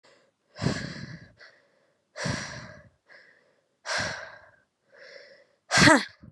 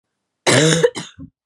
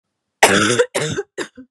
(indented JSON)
{
  "exhalation_length": "6.3 s",
  "exhalation_amplitude": 22708,
  "exhalation_signal_mean_std_ratio": 0.31,
  "cough_length": "1.5 s",
  "cough_amplitude": 32208,
  "cough_signal_mean_std_ratio": 0.48,
  "three_cough_length": "1.7 s",
  "three_cough_amplitude": 32768,
  "three_cough_signal_mean_std_ratio": 0.51,
  "survey_phase": "beta (2021-08-13 to 2022-03-07)",
  "age": "18-44",
  "gender": "Female",
  "wearing_mask": "No",
  "symptom_new_continuous_cough": true,
  "symptom_runny_or_blocked_nose": true,
  "symptom_sore_throat": true,
  "symptom_fatigue": true,
  "symptom_headache": true,
  "symptom_onset": "4 days",
  "smoker_status": "Never smoked",
  "respiratory_condition_asthma": true,
  "respiratory_condition_other": false,
  "recruitment_source": "Test and Trace",
  "submission_delay": "3 days",
  "covid_test_result": "Positive",
  "covid_test_method": "RT-qPCR"
}